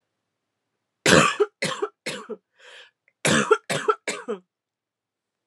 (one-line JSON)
{"cough_length": "5.5 s", "cough_amplitude": 32289, "cough_signal_mean_std_ratio": 0.36, "survey_phase": "alpha (2021-03-01 to 2021-08-12)", "age": "18-44", "gender": "Female", "wearing_mask": "No", "symptom_cough_any": true, "symptom_fatigue": true, "symptom_fever_high_temperature": true, "symptom_headache": true, "symptom_change_to_sense_of_smell_or_taste": true, "symptom_loss_of_taste": true, "smoker_status": "Current smoker (11 or more cigarettes per day)", "respiratory_condition_asthma": false, "respiratory_condition_other": false, "recruitment_source": "Test and Trace", "submission_delay": "2 days", "covid_test_result": "Positive", "covid_test_method": "LFT"}